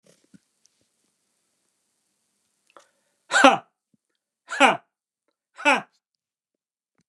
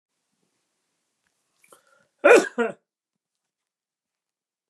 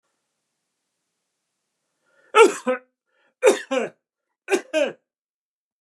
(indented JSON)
{
  "exhalation_length": "7.1 s",
  "exhalation_amplitude": 32718,
  "exhalation_signal_mean_std_ratio": 0.21,
  "cough_length": "4.7 s",
  "cough_amplitude": 29526,
  "cough_signal_mean_std_ratio": 0.19,
  "three_cough_length": "5.8 s",
  "three_cough_amplitude": 27474,
  "three_cough_signal_mean_std_ratio": 0.28,
  "survey_phase": "beta (2021-08-13 to 2022-03-07)",
  "age": "65+",
  "gender": "Male",
  "wearing_mask": "No",
  "symptom_runny_or_blocked_nose": true,
  "smoker_status": "Never smoked",
  "respiratory_condition_asthma": false,
  "respiratory_condition_other": false,
  "recruitment_source": "REACT",
  "submission_delay": "1 day",
  "covid_test_result": "Negative",
  "covid_test_method": "RT-qPCR",
  "covid_ct_value": 42.0,
  "covid_ct_gene": "N gene"
}